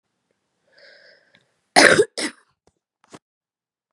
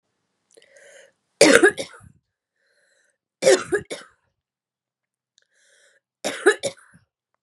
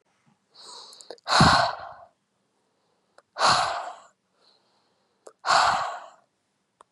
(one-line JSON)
{"cough_length": "3.9 s", "cough_amplitude": 32768, "cough_signal_mean_std_ratio": 0.23, "three_cough_length": "7.4 s", "three_cough_amplitude": 32768, "three_cough_signal_mean_std_ratio": 0.25, "exhalation_length": "6.9 s", "exhalation_amplitude": 18621, "exhalation_signal_mean_std_ratio": 0.36, "survey_phase": "beta (2021-08-13 to 2022-03-07)", "age": "18-44", "gender": "Female", "wearing_mask": "No", "symptom_cough_any": true, "symptom_shortness_of_breath": true, "symptom_fatigue": true, "symptom_onset": "12 days", "smoker_status": "Ex-smoker", "respiratory_condition_asthma": false, "respiratory_condition_other": false, "recruitment_source": "REACT", "submission_delay": "0 days", "covid_test_result": "Positive", "covid_test_method": "RT-qPCR", "covid_ct_value": 33.0, "covid_ct_gene": "E gene", "influenza_a_test_result": "Negative", "influenza_b_test_result": "Negative"}